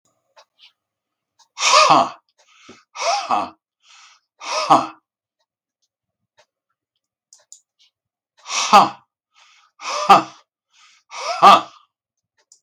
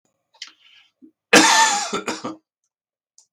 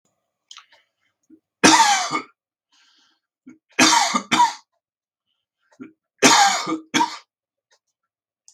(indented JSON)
{
  "exhalation_length": "12.6 s",
  "exhalation_amplitude": 32768,
  "exhalation_signal_mean_std_ratio": 0.3,
  "cough_length": "3.3 s",
  "cough_amplitude": 32768,
  "cough_signal_mean_std_ratio": 0.36,
  "three_cough_length": "8.5 s",
  "three_cough_amplitude": 32768,
  "three_cough_signal_mean_std_ratio": 0.36,
  "survey_phase": "beta (2021-08-13 to 2022-03-07)",
  "age": "65+",
  "gender": "Male",
  "wearing_mask": "No",
  "symptom_none": true,
  "smoker_status": "Ex-smoker",
  "respiratory_condition_asthma": false,
  "respiratory_condition_other": false,
  "recruitment_source": "REACT",
  "submission_delay": "3 days",
  "covid_test_result": "Negative",
  "covid_test_method": "RT-qPCR",
  "influenza_a_test_result": "Negative",
  "influenza_b_test_result": "Negative"
}